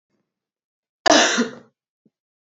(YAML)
cough_length: 2.5 s
cough_amplitude: 27318
cough_signal_mean_std_ratio: 0.3
survey_phase: beta (2021-08-13 to 2022-03-07)
age: 18-44
gender: Female
wearing_mask: 'No'
symptom_cough_any: true
symptom_runny_or_blocked_nose: true
symptom_sore_throat: true
smoker_status: Never smoked
respiratory_condition_asthma: false
respiratory_condition_other: false
recruitment_source: Test and Trace
submission_delay: 0 days
covid_test_result: Positive
covid_test_method: LFT